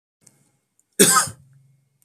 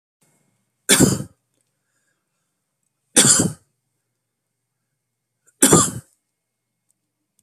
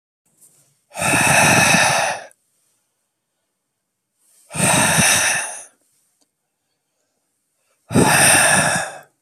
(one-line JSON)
{"cough_length": "2.0 s", "cough_amplitude": 32768, "cough_signal_mean_std_ratio": 0.29, "three_cough_length": "7.4 s", "three_cough_amplitude": 32768, "three_cough_signal_mean_std_ratio": 0.27, "exhalation_length": "9.2 s", "exhalation_amplitude": 32467, "exhalation_signal_mean_std_ratio": 0.5, "survey_phase": "beta (2021-08-13 to 2022-03-07)", "age": "45-64", "gender": "Male", "wearing_mask": "No", "symptom_none": true, "smoker_status": "Ex-smoker", "respiratory_condition_asthma": false, "respiratory_condition_other": false, "recruitment_source": "REACT", "submission_delay": "1 day", "covid_test_result": "Negative", "covid_test_method": "RT-qPCR"}